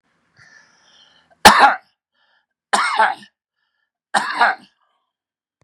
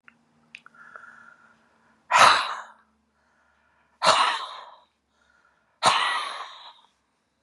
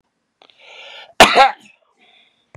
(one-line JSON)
{"three_cough_length": "5.6 s", "three_cough_amplitude": 32768, "three_cough_signal_mean_std_ratio": 0.3, "exhalation_length": "7.4 s", "exhalation_amplitude": 28969, "exhalation_signal_mean_std_ratio": 0.33, "cough_length": "2.6 s", "cough_amplitude": 32768, "cough_signal_mean_std_ratio": 0.27, "survey_phase": "beta (2021-08-13 to 2022-03-07)", "age": "45-64", "gender": "Male", "wearing_mask": "No", "symptom_none": true, "smoker_status": "Ex-smoker", "respiratory_condition_asthma": false, "respiratory_condition_other": false, "recruitment_source": "REACT", "submission_delay": "2 days", "covid_test_result": "Negative", "covid_test_method": "RT-qPCR", "influenza_a_test_result": "Negative", "influenza_b_test_result": "Negative"}